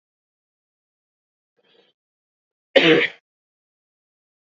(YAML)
cough_length: 4.5 s
cough_amplitude: 27682
cough_signal_mean_std_ratio: 0.2
survey_phase: beta (2021-08-13 to 2022-03-07)
age: 18-44
gender: Male
wearing_mask: 'No'
symptom_runny_or_blocked_nose: true
symptom_shortness_of_breath: true
smoker_status: Never smoked
respiratory_condition_asthma: false
respiratory_condition_other: false
recruitment_source: Test and Trace
submission_delay: 2 days
covid_test_result: Positive
covid_test_method: RT-qPCR
covid_ct_value: 19.0
covid_ct_gene: ORF1ab gene
covid_ct_mean: 19.3
covid_viral_load: 450000 copies/ml
covid_viral_load_category: Low viral load (10K-1M copies/ml)